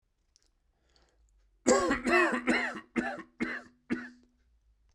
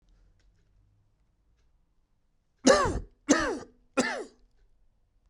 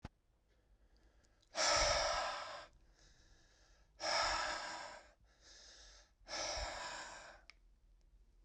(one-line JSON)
{"cough_length": "4.9 s", "cough_amplitude": 10900, "cough_signal_mean_std_ratio": 0.43, "three_cough_length": "5.3 s", "three_cough_amplitude": 15019, "three_cough_signal_mean_std_ratio": 0.3, "exhalation_length": "8.4 s", "exhalation_amplitude": 2479, "exhalation_signal_mean_std_ratio": 0.48, "survey_phase": "beta (2021-08-13 to 2022-03-07)", "age": "18-44", "gender": "Male", "wearing_mask": "No", "symptom_cough_any": true, "symptom_new_continuous_cough": true, "symptom_runny_or_blocked_nose": true, "symptom_shortness_of_breath": true, "symptom_diarrhoea": true, "symptom_fatigue": true, "symptom_fever_high_temperature": true, "symptom_headache": true, "symptom_loss_of_taste": true, "symptom_onset": "4 days", "smoker_status": "Never smoked", "respiratory_condition_asthma": false, "respiratory_condition_other": false, "recruitment_source": "Test and Trace", "submission_delay": "2 days", "covid_test_result": "Positive", "covid_test_method": "ePCR"}